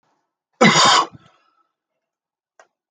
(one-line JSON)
{"cough_length": "2.9 s", "cough_amplitude": 32134, "cough_signal_mean_std_ratio": 0.32, "survey_phase": "beta (2021-08-13 to 2022-03-07)", "age": "45-64", "gender": "Male", "wearing_mask": "No", "symptom_cough_any": true, "symptom_runny_or_blocked_nose": true, "symptom_sore_throat": true, "symptom_abdominal_pain": true, "symptom_diarrhoea": true, "symptom_fever_high_temperature": true, "symptom_headache": true, "symptom_change_to_sense_of_smell_or_taste": true, "symptom_onset": "3 days", "smoker_status": "Never smoked", "respiratory_condition_asthma": false, "respiratory_condition_other": false, "recruitment_source": "Test and Trace", "submission_delay": "1 day", "covid_test_result": "Positive", "covid_test_method": "RT-qPCR"}